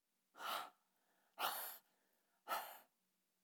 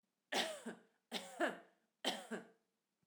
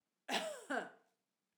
{
  "exhalation_length": "3.4 s",
  "exhalation_amplitude": 1422,
  "exhalation_signal_mean_std_ratio": 0.41,
  "three_cough_length": "3.1 s",
  "three_cough_amplitude": 2013,
  "three_cough_signal_mean_std_ratio": 0.43,
  "cough_length": "1.6 s",
  "cough_amplitude": 2239,
  "cough_signal_mean_std_ratio": 0.45,
  "survey_phase": "alpha (2021-03-01 to 2021-08-12)",
  "age": "45-64",
  "gender": "Female",
  "wearing_mask": "No",
  "symptom_cough_any": true,
  "smoker_status": "Never smoked",
  "respiratory_condition_asthma": false,
  "respiratory_condition_other": false,
  "recruitment_source": "REACT",
  "submission_delay": "1 day",
  "covid_test_result": "Negative",
  "covid_test_method": "RT-qPCR"
}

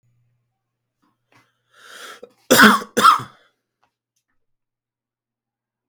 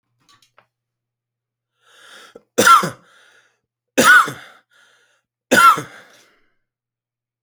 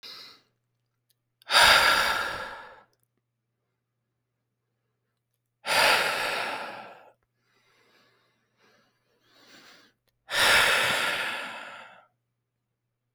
{
  "cough_length": "5.9 s",
  "cough_amplitude": 32767,
  "cough_signal_mean_std_ratio": 0.24,
  "three_cough_length": "7.4 s",
  "three_cough_amplitude": 32767,
  "three_cough_signal_mean_std_ratio": 0.29,
  "exhalation_length": "13.1 s",
  "exhalation_amplitude": 19947,
  "exhalation_signal_mean_std_ratio": 0.38,
  "survey_phase": "alpha (2021-03-01 to 2021-08-12)",
  "age": "18-44",
  "gender": "Male",
  "wearing_mask": "No",
  "symptom_none": true,
  "smoker_status": "Never smoked",
  "respiratory_condition_asthma": false,
  "respiratory_condition_other": false,
  "recruitment_source": "REACT",
  "submission_delay": "1 day",
  "covid_test_result": "Negative",
  "covid_test_method": "RT-qPCR"
}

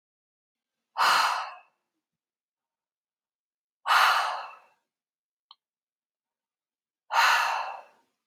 {
  "exhalation_length": "8.3 s",
  "exhalation_amplitude": 11529,
  "exhalation_signal_mean_std_ratio": 0.35,
  "survey_phase": "alpha (2021-03-01 to 2021-08-12)",
  "age": "18-44",
  "gender": "Male",
  "wearing_mask": "No",
  "symptom_none": true,
  "smoker_status": "Ex-smoker",
  "respiratory_condition_asthma": false,
  "respiratory_condition_other": false,
  "recruitment_source": "REACT",
  "submission_delay": "1 day",
  "covid_test_result": "Negative",
  "covid_test_method": "RT-qPCR"
}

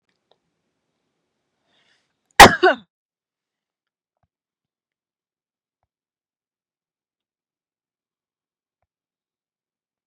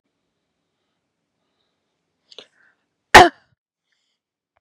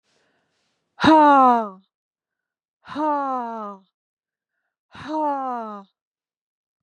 {
  "cough_length": "10.1 s",
  "cough_amplitude": 32768,
  "cough_signal_mean_std_ratio": 0.11,
  "three_cough_length": "4.6 s",
  "three_cough_amplitude": 32768,
  "three_cough_signal_mean_std_ratio": 0.14,
  "exhalation_length": "6.8 s",
  "exhalation_amplitude": 24971,
  "exhalation_signal_mean_std_ratio": 0.37,
  "survey_phase": "beta (2021-08-13 to 2022-03-07)",
  "age": "45-64",
  "gender": "Female",
  "wearing_mask": "No",
  "symptom_none": true,
  "smoker_status": "Never smoked",
  "respiratory_condition_asthma": false,
  "respiratory_condition_other": false,
  "recruitment_source": "REACT",
  "submission_delay": "6 days",
  "covid_test_result": "Negative",
  "covid_test_method": "RT-qPCR",
  "influenza_a_test_result": "Negative",
  "influenza_b_test_result": "Negative"
}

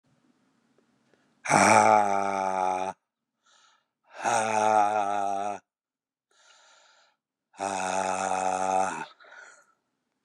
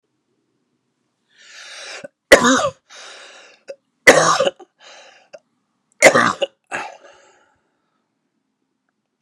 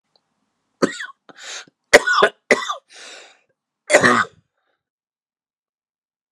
{
  "exhalation_length": "10.2 s",
  "exhalation_amplitude": 21429,
  "exhalation_signal_mean_std_ratio": 0.47,
  "three_cough_length": "9.2 s",
  "three_cough_amplitude": 32768,
  "three_cough_signal_mean_std_ratio": 0.28,
  "cough_length": "6.3 s",
  "cough_amplitude": 32768,
  "cough_signal_mean_std_ratio": 0.29,
  "survey_phase": "beta (2021-08-13 to 2022-03-07)",
  "age": "45-64",
  "gender": "Male",
  "wearing_mask": "No",
  "symptom_cough_any": true,
  "symptom_runny_or_blocked_nose": true,
  "symptom_onset": "3 days",
  "smoker_status": "Never smoked",
  "respiratory_condition_asthma": false,
  "respiratory_condition_other": false,
  "recruitment_source": "Test and Trace",
  "submission_delay": "2 days",
  "covid_test_result": "Positive",
  "covid_test_method": "RT-qPCR",
  "covid_ct_value": 15.6,
  "covid_ct_gene": "ORF1ab gene",
  "covid_ct_mean": 16.0,
  "covid_viral_load": "5900000 copies/ml",
  "covid_viral_load_category": "High viral load (>1M copies/ml)"
}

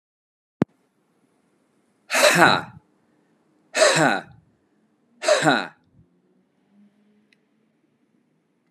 {
  "exhalation_length": "8.7 s",
  "exhalation_amplitude": 31888,
  "exhalation_signal_mean_std_ratio": 0.3,
  "survey_phase": "beta (2021-08-13 to 2022-03-07)",
  "age": "18-44",
  "wearing_mask": "No",
  "symptom_none": true,
  "smoker_status": "Ex-smoker",
  "respiratory_condition_asthma": true,
  "respiratory_condition_other": false,
  "recruitment_source": "Test and Trace",
  "submission_delay": "0 days",
  "covid_test_result": "Negative",
  "covid_test_method": "LFT"
}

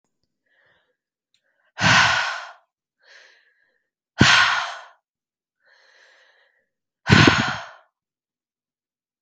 {
  "exhalation_length": "9.2 s",
  "exhalation_amplitude": 32768,
  "exhalation_signal_mean_std_ratio": 0.31,
  "survey_phase": "beta (2021-08-13 to 2022-03-07)",
  "age": "18-44",
  "gender": "Female",
  "wearing_mask": "No",
  "symptom_none": true,
  "symptom_onset": "12 days",
  "smoker_status": "Never smoked",
  "respiratory_condition_asthma": false,
  "respiratory_condition_other": false,
  "recruitment_source": "REACT",
  "submission_delay": "2 days",
  "covid_test_result": "Negative",
  "covid_test_method": "RT-qPCR",
  "influenza_a_test_result": "Negative",
  "influenza_b_test_result": "Negative"
}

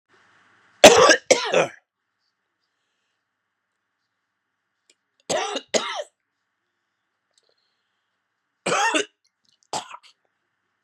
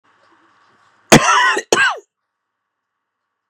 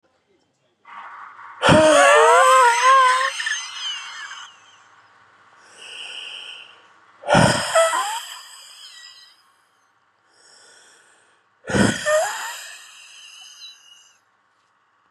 {
  "three_cough_length": "10.8 s",
  "three_cough_amplitude": 32768,
  "three_cough_signal_mean_std_ratio": 0.24,
  "cough_length": "3.5 s",
  "cough_amplitude": 32768,
  "cough_signal_mean_std_ratio": 0.34,
  "exhalation_length": "15.1 s",
  "exhalation_amplitude": 28671,
  "exhalation_signal_mean_std_ratio": 0.43,
  "survey_phase": "beta (2021-08-13 to 2022-03-07)",
  "age": "45-64",
  "gender": "Male",
  "wearing_mask": "No",
  "symptom_cough_any": true,
  "symptom_runny_or_blocked_nose": true,
  "symptom_fatigue": true,
  "symptom_fever_high_temperature": true,
  "symptom_headache": true,
  "symptom_change_to_sense_of_smell_or_taste": true,
  "symptom_onset": "2 days",
  "smoker_status": "Never smoked",
  "respiratory_condition_asthma": false,
  "respiratory_condition_other": false,
  "recruitment_source": "Test and Trace",
  "submission_delay": "1 day",
  "covid_test_result": "Positive",
  "covid_test_method": "RT-qPCR",
  "covid_ct_value": 21.9,
  "covid_ct_gene": "ORF1ab gene",
  "covid_ct_mean": 22.2,
  "covid_viral_load": "54000 copies/ml",
  "covid_viral_load_category": "Low viral load (10K-1M copies/ml)"
}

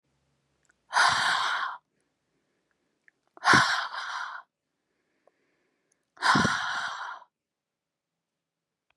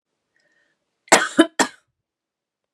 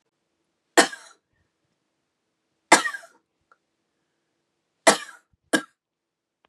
{
  "exhalation_length": "9.0 s",
  "exhalation_amplitude": 16707,
  "exhalation_signal_mean_std_ratio": 0.38,
  "cough_length": "2.7 s",
  "cough_amplitude": 32767,
  "cough_signal_mean_std_ratio": 0.23,
  "three_cough_length": "6.5 s",
  "three_cough_amplitude": 31147,
  "three_cough_signal_mean_std_ratio": 0.18,
  "survey_phase": "beta (2021-08-13 to 2022-03-07)",
  "age": "18-44",
  "gender": "Female",
  "wearing_mask": "No",
  "symptom_cough_any": true,
  "symptom_change_to_sense_of_smell_or_taste": true,
  "smoker_status": "Never smoked",
  "respiratory_condition_asthma": false,
  "respiratory_condition_other": false,
  "recruitment_source": "Test and Trace",
  "submission_delay": "2 days",
  "covid_test_result": "Positive",
  "covid_test_method": "ePCR"
}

